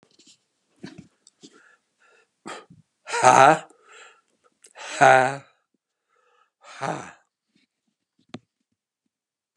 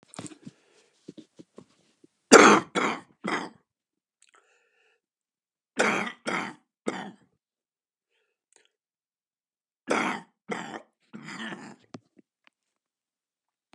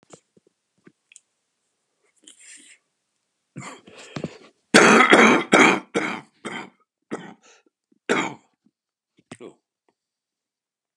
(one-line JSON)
{"exhalation_length": "9.6 s", "exhalation_amplitude": 32600, "exhalation_signal_mean_std_ratio": 0.23, "three_cough_length": "13.7 s", "three_cough_amplitude": 32768, "three_cough_signal_mean_std_ratio": 0.22, "cough_length": "11.0 s", "cough_amplitude": 32768, "cough_signal_mean_std_ratio": 0.28, "survey_phase": "beta (2021-08-13 to 2022-03-07)", "age": "65+", "gender": "Male", "wearing_mask": "No", "symptom_cough_any": true, "symptom_runny_or_blocked_nose": true, "symptom_fatigue": true, "symptom_headache": true, "smoker_status": "Never smoked", "respiratory_condition_asthma": false, "respiratory_condition_other": false, "recruitment_source": "Test and Trace", "submission_delay": "2 days", "covid_test_result": "Positive", "covid_test_method": "RT-qPCR", "covid_ct_value": 24.7, "covid_ct_gene": "N gene"}